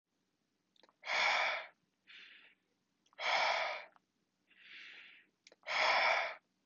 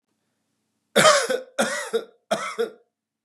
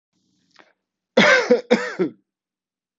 {
  "exhalation_length": "6.7 s",
  "exhalation_amplitude": 3349,
  "exhalation_signal_mean_std_ratio": 0.46,
  "three_cough_length": "3.2 s",
  "three_cough_amplitude": 26216,
  "three_cough_signal_mean_std_ratio": 0.42,
  "cough_length": "3.0 s",
  "cough_amplitude": 27832,
  "cough_signal_mean_std_ratio": 0.37,
  "survey_phase": "beta (2021-08-13 to 2022-03-07)",
  "age": "18-44",
  "gender": "Male",
  "wearing_mask": "No",
  "symptom_cough_any": true,
  "symptom_fatigue": true,
  "smoker_status": "Never smoked",
  "respiratory_condition_asthma": false,
  "respiratory_condition_other": false,
  "recruitment_source": "Test and Trace",
  "submission_delay": "1 day",
  "covid_test_result": "Positive",
  "covid_test_method": "LFT"
}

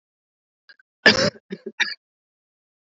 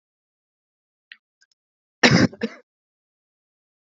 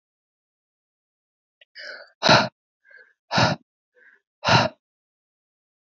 {
  "three_cough_length": "3.0 s",
  "three_cough_amplitude": 32572,
  "three_cough_signal_mean_std_ratio": 0.24,
  "cough_length": "3.8 s",
  "cough_amplitude": 27818,
  "cough_signal_mean_std_ratio": 0.21,
  "exhalation_length": "5.9 s",
  "exhalation_amplitude": 25355,
  "exhalation_signal_mean_std_ratio": 0.27,
  "survey_phase": "beta (2021-08-13 to 2022-03-07)",
  "age": "45-64",
  "gender": "Female",
  "wearing_mask": "No",
  "symptom_cough_any": true,
  "symptom_runny_or_blocked_nose": true,
  "symptom_change_to_sense_of_smell_or_taste": true,
  "symptom_onset": "4 days",
  "smoker_status": "Never smoked",
  "respiratory_condition_asthma": false,
  "respiratory_condition_other": false,
  "recruitment_source": "Test and Trace",
  "submission_delay": "1 day",
  "covid_test_result": "Positive",
  "covid_test_method": "RT-qPCR",
  "covid_ct_value": 29.6,
  "covid_ct_gene": "ORF1ab gene",
  "covid_ct_mean": 29.7,
  "covid_viral_load": "190 copies/ml",
  "covid_viral_load_category": "Minimal viral load (< 10K copies/ml)"
}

